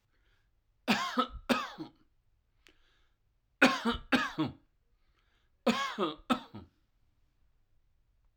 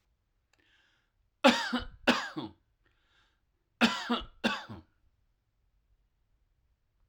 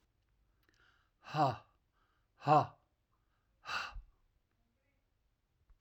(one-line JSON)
{"three_cough_length": "8.4 s", "three_cough_amplitude": 10604, "three_cough_signal_mean_std_ratio": 0.34, "cough_length": "7.1 s", "cough_amplitude": 12492, "cough_signal_mean_std_ratio": 0.28, "exhalation_length": "5.8 s", "exhalation_amplitude": 5409, "exhalation_signal_mean_std_ratio": 0.25, "survey_phase": "alpha (2021-03-01 to 2021-08-12)", "age": "45-64", "gender": "Male", "wearing_mask": "No", "symptom_none": true, "smoker_status": "Ex-smoker", "respiratory_condition_asthma": false, "respiratory_condition_other": false, "recruitment_source": "REACT", "submission_delay": "1 day", "covid_test_result": "Negative", "covid_test_method": "RT-qPCR"}